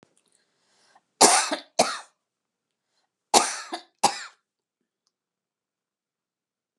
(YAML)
cough_length: 6.8 s
cough_amplitude: 30842
cough_signal_mean_std_ratio: 0.24
survey_phase: beta (2021-08-13 to 2022-03-07)
age: 65+
gender: Female
wearing_mask: 'No'
symptom_none: true
smoker_status: Never smoked
respiratory_condition_asthma: false
respiratory_condition_other: false
recruitment_source: REACT
submission_delay: 1 day
covid_test_result: Negative
covid_test_method: RT-qPCR